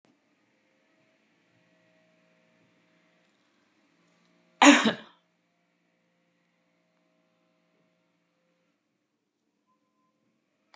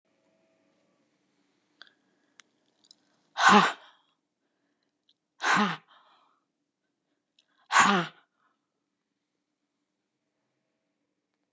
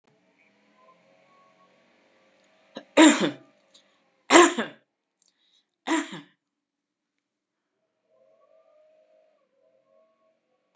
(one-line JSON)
{"cough_length": "10.8 s", "cough_amplitude": 23774, "cough_signal_mean_std_ratio": 0.13, "exhalation_length": "11.5 s", "exhalation_amplitude": 20279, "exhalation_signal_mean_std_ratio": 0.22, "three_cough_length": "10.8 s", "three_cough_amplitude": 29282, "three_cough_signal_mean_std_ratio": 0.2, "survey_phase": "beta (2021-08-13 to 2022-03-07)", "age": "65+", "gender": "Female", "wearing_mask": "No", "symptom_none": true, "smoker_status": "Ex-smoker", "respiratory_condition_asthma": false, "respiratory_condition_other": false, "recruitment_source": "REACT", "submission_delay": "1 day", "covid_test_result": "Negative", "covid_test_method": "RT-qPCR"}